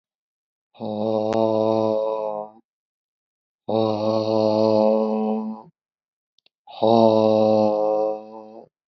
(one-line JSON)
{"exhalation_length": "8.9 s", "exhalation_amplitude": 24733, "exhalation_signal_mean_std_ratio": 0.57, "survey_phase": "beta (2021-08-13 to 2022-03-07)", "age": "45-64", "gender": "Male", "wearing_mask": "No", "symptom_none": true, "smoker_status": "Never smoked", "respiratory_condition_asthma": true, "respiratory_condition_other": false, "recruitment_source": "REACT", "submission_delay": "1 day", "covid_test_result": "Negative", "covid_test_method": "RT-qPCR"}